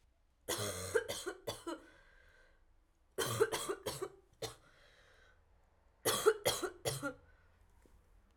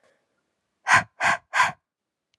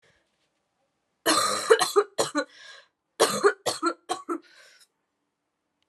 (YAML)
three_cough_length: 8.4 s
three_cough_amplitude: 5883
three_cough_signal_mean_std_ratio: 0.42
exhalation_length: 2.4 s
exhalation_amplitude: 20841
exhalation_signal_mean_std_ratio: 0.35
cough_length: 5.9 s
cough_amplitude: 19771
cough_signal_mean_std_ratio: 0.38
survey_phase: alpha (2021-03-01 to 2021-08-12)
age: 18-44
gender: Female
wearing_mask: 'No'
symptom_cough_any: true
symptom_fatigue: true
symptom_headache: true
smoker_status: Never smoked
respiratory_condition_asthma: false
respiratory_condition_other: false
recruitment_source: Test and Trace
submission_delay: 2 days
covid_test_result: Positive
covid_test_method: RT-qPCR
covid_ct_value: 15.8
covid_ct_gene: N gene
covid_ct_mean: 16.0
covid_viral_load: 5900000 copies/ml
covid_viral_load_category: High viral load (>1M copies/ml)